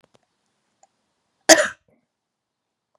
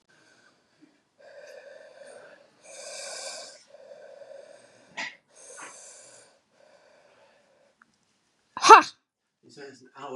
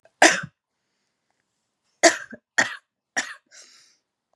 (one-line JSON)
{"cough_length": "3.0 s", "cough_amplitude": 32768, "cough_signal_mean_std_ratio": 0.17, "exhalation_length": "10.2 s", "exhalation_amplitude": 32401, "exhalation_signal_mean_std_ratio": 0.16, "three_cough_length": "4.4 s", "three_cough_amplitude": 31550, "three_cough_signal_mean_std_ratio": 0.24, "survey_phase": "beta (2021-08-13 to 2022-03-07)", "age": "18-44", "gender": "Female", "wearing_mask": "No", "symptom_none": true, "smoker_status": "Never smoked", "respiratory_condition_asthma": false, "respiratory_condition_other": false, "recruitment_source": "REACT", "submission_delay": "1 day", "covid_test_result": "Negative", "covid_test_method": "RT-qPCR", "influenza_a_test_result": "Negative", "influenza_b_test_result": "Negative"}